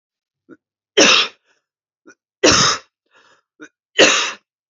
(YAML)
three_cough_length: 4.7 s
three_cough_amplitude: 32768
three_cough_signal_mean_std_ratio: 0.36
survey_phase: beta (2021-08-13 to 2022-03-07)
age: 18-44
gender: Female
wearing_mask: 'No'
symptom_cough_any: true
symptom_new_continuous_cough: true
symptom_runny_or_blocked_nose: true
symptom_sore_throat: true
symptom_onset: 3 days
smoker_status: Never smoked
respiratory_condition_asthma: false
respiratory_condition_other: false
recruitment_source: Test and Trace
submission_delay: 1 day
covid_test_result: Positive
covid_test_method: RT-qPCR
covid_ct_value: 22.5
covid_ct_gene: ORF1ab gene
covid_ct_mean: 22.7
covid_viral_load: 36000 copies/ml
covid_viral_load_category: Low viral load (10K-1M copies/ml)